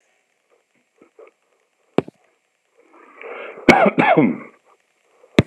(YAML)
cough_length: 5.5 s
cough_amplitude: 32768
cough_signal_mean_std_ratio: 0.29
survey_phase: beta (2021-08-13 to 2022-03-07)
age: 45-64
gender: Male
wearing_mask: 'No'
symptom_none: true
symptom_onset: 12 days
smoker_status: Never smoked
respiratory_condition_asthma: false
respiratory_condition_other: false
recruitment_source: REACT
submission_delay: 3 days
covid_test_result: Negative
covid_test_method: RT-qPCR
influenza_a_test_result: Negative
influenza_b_test_result: Negative